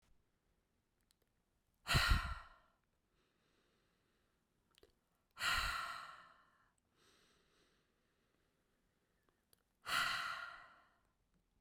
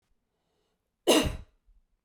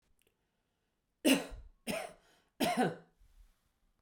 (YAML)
exhalation_length: 11.6 s
exhalation_amplitude: 2868
exhalation_signal_mean_std_ratio: 0.3
cough_length: 2.0 s
cough_amplitude: 11996
cough_signal_mean_std_ratio: 0.28
three_cough_length: 4.0 s
three_cough_amplitude: 6247
three_cough_signal_mean_std_ratio: 0.33
survey_phase: beta (2021-08-13 to 2022-03-07)
age: 45-64
gender: Female
wearing_mask: 'No'
symptom_none: true
symptom_onset: 7 days
smoker_status: Never smoked
respiratory_condition_asthma: false
respiratory_condition_other: false
recruitment_source: REACT
submission_delay: 4 days
covid_test_result: Negative
covid_test_method: RT-qPCR